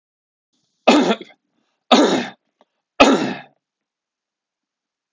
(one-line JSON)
{"three_cough_length": "5.1 s", "three_cough_amplitude": 32768, "three_cough_signal_mean_std_ratio": 0.33, "survey_phase": "alpha (2021-03-01 to 2021-08-12)", "age": "45-64", "gender": "Male", "wearing_mask": "No", "symptom_none": true, "smoker_status": "Never smoked", "respiratory_condition_asthma": false, "respiratory_condition_other": false, "recruitment_source": "REACT", "submission_delay": "1 day", "covid_test_result": "Negative", "covid_test_method": "RT-qPCR"}